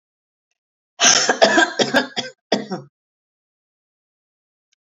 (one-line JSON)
{"cough_length": "4.9 s", "cough_amplitude": 32768, "cough_signal_mean_std_ratio": 0.36, "survey_phase": "beta (2021-08-13 to 2022-03-07)", "age": "65+", "gender": "Female", "wearing_mask": "No", "symptom_none": true, "symptom_onset": "9 days", "smoker_status": "Never smoked", "respiratory_condition_asthma": false, "respiratory_condition_other": false, "recruitment_source": "REACT", "submission_delay": "3 days", "covid_test_result": "Negative", "covid_test_method": "RT-qPCR", "influenza_a_test_result": "Negative", "influenza_b_test_result": "Negative"}